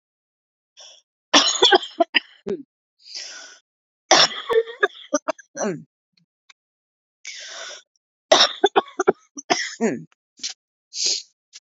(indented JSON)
{
  "three_cough_length": "11.6 s",
  "three_cough_amplitude": 32768,
  "three_cough_signal_mean_std_ratio": 0.34,
  "survey_phase": "beta (2021-08-13 to 2022-03-07)",
  "age": "45-64",
  "gender": "Female",
  "wearing_mask": "No",
  "symptom_cough_any": true,
  "symptom_runny_or_blocked_nose": true,
  "symptom_shortness_of_breath": true,
  "symptom_sore_throat": true,
  "symptom_abdominal_pain": true,
  "symptom_diarrhoea": true,
  "symptom_fever_high_temperature": true,
  "symptom_onset": "3 days",
  "smoker_status": "Never smoked",
  "respiratory_condition_asthma": false,
  "respiratory_condition_other": false,
  "recruitment_source": "Test and Trace",
  "submission_delay": "1 day",
  "covid_test_result": "Positive",
  "covid_test_method": "RT-qPCR",
  "covid_ct_value": 15.0,
  "covid_ct_gene": "ORF1ab gene",
  "covid_ct_mean": 15.4,
  "covid_viral_load": "8900000 copies/ml",
  "covid_viral_load_category": "High viral load (>1M copies/ml)"
}